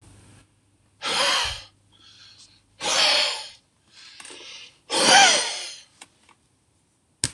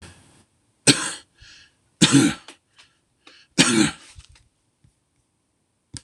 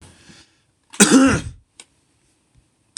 {"exhalation_length": "7.3 s", "exhalation_amplitude": 25513, "exhalation_signal_mean_std_ratio": 0.4, "three_cough_length": "6.0 s", "three_cough_amplitude": 26028, "three_cough_signal_mean_std_ratio": 0.29, "cough_length": "3.0 s", "cough_amplitude": 26028, "cough_signal_mean_std_ratio": 0.31, "survey_phase": "beta (2021-08-13 to 2022-03-07)", "age": "45-64", "gender": "Male", "wearing_mask": "No", "symptom_none": true, "smoker_status": "Current smoker (11 or more cigarettes per day)", "respiratory_condition_asthma": false, "respiratory_condition_other": false, "recruitment_source": "REACT", "submission_delay": "3 days", "covid_test_result": "Negative", "covid_test_method": "RT-qPCR", "influenza_a_test_result": "Negative", "influenza_b_test_result": "Negative"}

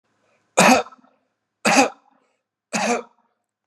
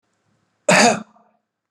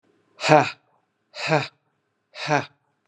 {"three_cough_length": "3.7 s", "three_cough_amplitude": 32503, "three_cough_signal_mean_std_ratio": 0.35, "cough_length": "1.7 s", "cough_amplitude": 30452, "cough_signal_mean_std_ratio": 0.34, "exhalation_length": "3.1 s", "exhalation_amplitude": 32530, "exhalation_signal_mean_std_ratio": 0.32, "survey_phase": "beta (2021-08-13 to 2022-03-07)", "age": "45-64", "gender": "Male", "wearing_mask": "No", "symptom_none": true, "smoker_status": "Never smoked", "respiratory_condition_asthma": false, "respiratory_condition_other": false, "recruitment_source": "REACT", "submission_delay": "1 day", "covid_test_result": "Negative", "covid_test_method": "RT-qPCR"}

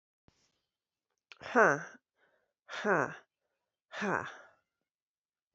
{"exhalation_length": "5.5 s", "exhalation_amplitude": 9814, "exhalation_signal_mean_std_ratio": 0.27, "survey_phase": "beta (2021-08-13 to 2022-03-07)", "age": "45-64", "gender": "Female", "wearing_mask": "No", "symptom_runny_or_blocked_nose": true, "symptom_headache": true, "symptom_change_to_sense_of_smell_or_taste": true, "symptom_onset": "3 days", "smoker_status": "Ex-smoker", "respiratory_condition_asthma": false, "respiratory_condition_other": false, "recruitment_source": "Test and Trace", "submission_delay": "2 days", "covid_test_result": "Positive", "covid_test_method": "RT-qPCR", "covid_ct_value": 23.9, "covid_ct_gene": "ORF1ab gene", "covid_ct_mean": 24.2, "covid_viral_load": "11000 copies/ml", "covid_viral_load_category": "Low viral load (10K-1M copies/ml)"}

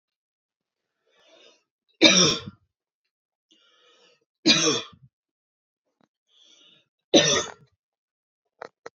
{"three_cough_length": "9.0 s", "three_cough_amplitude": 29129, "three_cough_signal_mean_std_ratio": 0.26, "survey_phase": "beta (2021-08-13 to 2022-03-07)", "age": "18-44", "gender": "Female", "wearing_mask": "No", "symptom_none": true, "smoker_status": "Never smoked", "respiratory_condition_asthma": false, "respiratory_condition_other": false, "recruitment_source": "REACT", "submission_delay": "2 days", "covid_test_result": "Negative", "covid_test_method": "RT-qPCR"}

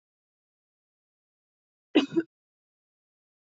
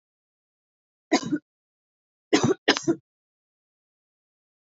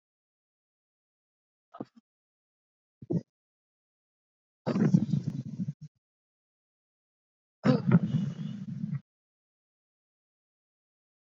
{"cough_length": "3.5 s", "cough_amplitude": 11768, "cough_signal_mean_std_ratio": 0.17, "three_cough_length": "4.8 s", "three_cough_amplitude": 20687, "three_cough_signal_mean_std_ratio": 0.26, "exhalation_length": "11.3 s", "exhalation_amplitude": 12385, "exhalation_signal_mean_std_ratio": 0.3, "survey_phase": "beta (2021-08-13 to 2022-03-07)", "age": "18-44", "gender": "Female", "wearing_mask": "No", "symptom_none": true, "symptom_onset": "2 days", "smoker_status": "Never smoked", "respiratory_condition_asthma": false, "respiratory_condition_other": false, "recruitment_source": "REACT", "submission_delay": "2 days", "covid_test_result": "Negative", "covid_test_method": "RT-qPCR", "influenza_a_test_result": "Unknown/Void", "influenza_b_test_result": "Unknown/Void"}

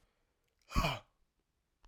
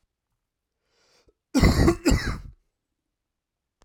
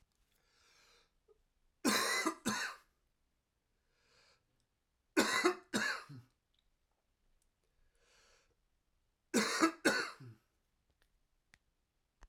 {"exhalation_length": "1.9 s", "exhalation_amplitude": 3847, "exhalation_signal_mean_std_ratio": 0.28, "cough_length": "3.8 s", "cough_amplitude": 18395, "cough_signal_mean_std_ratio": 0.33, "three_cough_length": "12.3 s", "three_cough_amplitude": 4695, "three_cough_signal_mean_std_ratio": 0.32, "survey_phase": "alpha (2021-03-01 to 2021-08-12)", "age": "45-64", "gender": "Male", "wearing_mask": "No", "symptom_cough_any": true, "symptom_fatigue": true, "symptom_headache": true, "symptom_change_to_sense_of_smell_or_taste": true, "symptom_loss_of_taste": true, "symptom_onset": "3 days", "smoker_status": "Ex-smoker", "respiratory_condition_asthma": false, "respiratory_condition_other": false, "recruitment_source": "Test and Trace", "submission_delay": "2 days", "covid_test_result": "Positive", "covid_test_method": "RT-qPCR", "covid_ct_value": 21.2, "covid_ct_gene": "ORF1ab gene"}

